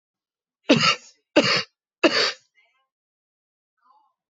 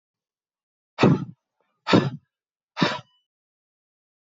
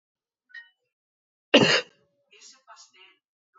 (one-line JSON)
{"three_cough_length": "4.4 s", "three_cough_amplitude": 23180, "three_cough_signal_mean_std_ratio": 0.32, "exhalation_length": "4.3 s", "exhalation_amplitude": 24090, "exhalation_signal_mean_std_ratio": 0.28, "cough_length": "3.6 s", "cough_amplitude": 22104, "cough_signal_mean_std_ratio": 0.22, "survey_phase": "beta (2021-08-13 to 2022-03-07)", "age": "45-64", "gender": "Male", "wearing_mask": "No", "symptom_none": true, "symptom_onset": "5 days", "smoker_status": "Never smoked", "respiratory_condition_asthma": false, "respiratory_condition_other": false, "recruitment_source": "Test and Trace", "submission_delay": "3 days", "covid_test_result": "Negative", "covid_test_method": "ePCR"}